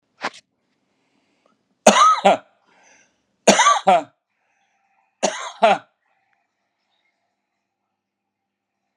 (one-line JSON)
{"three_cough_length": "9.0 s", "three_cough_amplitude": 32768, "three_cough_signal_mean_std_ratio": 0.29, "survey_phase": "beta (2021-08-13 to 2022-03-07)", "age": "45-64", "gender": "Male", "wearing_mask": "No", "symptom_none": true, "symptom_onset": "8 days", "smoker_status": "Never smoked", "respiratory_condition_asthma": false, "respiratory_condition_other": false, "recruitment_source": "REACT", "submission_delay": "1 day", "covid_test_result": "Negative", "covid_test_method": "RT-qPCR"}